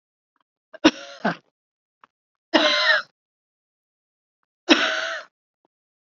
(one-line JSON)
{"three_cough_length": "6.1 s", "three_cough_amplitude": 29012, "three_cough_signal_mean_std_ratio": 0.31, "survey_phase": "beta (2021-08-13 to 2022-03-07)", "age": "45-64", "gender": "Female", "wearing_mask": "No", "symptom_none": true, "smoker_status": "Ex-smoker", "respiratory_condition_asthma": false, "respiratory_condition_other": false, "recruitment_source": "REACT", "submission_delay": "2 days", "covid_test_result": "Negative", "covid_test_method": "RT-qPCR", "influenza_a_test_result": "Negative", "influenza_b_test_result": "Negative"}